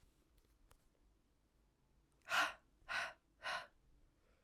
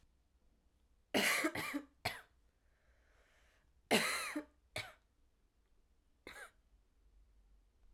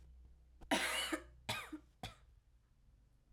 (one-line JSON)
{"exhalation_length": "4.4 s", "exhalation_amplitude": 2011, "exhalation_signal_mean_std_ratio": 0.32, "three_cough_length": "7.9 s", "three_cough_amplitude": 4809, "three_cough_signal_mean_std_ratio": 0.33, "cough_length": "3.3 s", "cough_amplitude": 2883, "cough_signal_mean_std_ratio": 0.44, "survey_phase": "alpha (2021-03-01 to 2021-08-12)", "age": "18-44", "gender": "Female", "wearing_mask": "Yes", "symptom_cough_any": true, "symptom_new_continuous_cough": true, "symptom_fatigue": true, "symptom_change_to_sense_of_smell_or_taste": true, "smoker_status": "Current smoker (1 to 10 cigarettes per day)", "respiratory_condition_asthma": false, "respiratory_condition_other": false, "recruitment_source": "Test and Trace", "submission_delay": "2 days", "covid_test_result": "Positive", "covid_test_method": "RT-qPCR"}